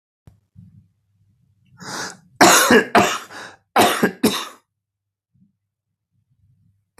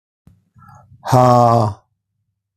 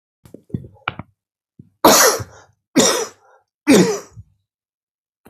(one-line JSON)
{"cough_length": "7.0 s", "cough_amplitude": 32768, "cough_signal_mean_std_ratio": 0.34, "exhalation_length": "2.6 s", "exhalation_amplitude": 32766, "exhalation_signal_mean_std_ratio": 0.42, "three_cough_length": "5.3 s", "three_cough_amplitude": 32768, "three_cough_signal_mean_std_ratio": 0.35, "survey_phase": "beta (2021-08-13 to 2022-03-07)", "age": "65+", "gender": "Male", "wearing_mask": "No", "symptom_cough_any": true, "symptom_runny_or_blocked_nose": true, "symptom_headache": true, "symptom_onset": "4 days", "smoker_status": "Never smoked", "respiratory_condition_asthma": false, "respiratory_condition_other": false, "recruitment_source": "Test and Trace", "submission_delay": "1 day", "covid_test_result": "Negative", "covid_test_method": "RT-qPCR"}